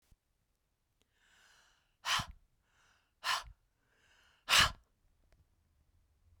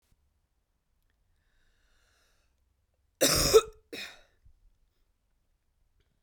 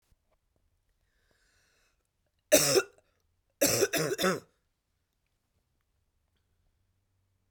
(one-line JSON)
{"exhalation_length": "6.4 s", "exhalation_amplitude": 6921, "exhalation_signal_mean_std_ratio": 0.23, "cough_length": "6.2 s", "cough_amplitude": 13140, "cough_signal_mean_std_ratio": 0.2, "three_cough_length": "7.5 s", "three_cough_amplitude": 13887, "three_cough_signal_mean_std_ratio": 0.27, "survey_phase": "beta (2021-08-13 to 2022-03-07)", "age": "18-44", "gender": "Female", "wearing_mask": "No", "symptom_cough_any": true, "symptom_runny_or_blocked_nose": true, "symptom_sore_throat": true, "smoker_status": "Never smoked", "respiratory_condition_asthma": true, "respiratory_condition_other": false, "recruitment_source": "REACT", "submission_delay": "10 days", "covid_test_result": "Negative", "covid_test_method": "RT-qPCR"}